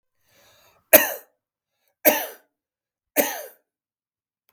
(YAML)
three_cough_length: 4.5 s
three_cough_amplitude: 32768
three_cough_signal_mean_std_ratio: 0.23
survey_phase: beta (2021-08-13 to 2022-03-07)
age: 45-64
gender: Male
wearing_mask: 'No'
symptom_none: true
smoker_status: Ex-smoker
respiratory_condition_asthma: false
respiratory_condition_other: false
recruitment_source: REACT
submission_delay: 1 day
covid_test_result: Negative
covid_test_method: RT-qPCR
influenza_a_test_result: Negative
influenza_b_test_result: Negative